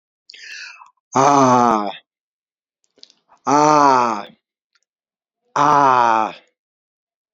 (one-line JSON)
{"exhalation_length": "7.3 s", "exhalation_amplitude": 32768, "exhalation_signal_mean_std_ratio": 0.43, "survey_phase": "beta (2021-08-13 to 2022-03-07)", "age": "65+", "gender": "Male", "wearing_mask": "No", "symptom_cough_any": true, "symptom_sore_throat": true, "smoker_status": "Ex-smoker", "respiratory_condition_asthma": false, "respiratory_condition_other": false, "recruitment_source": "REACT", "submission_delay": "1 day", "covid_test_result": "Positive", "covid_test_method": "RT-qPCR", "covid_ct_value": 21.0, "covid_ct_gene": "E gene", "influenza_a_test_result": "Negative", "influenza_b_test_result": "Negative"}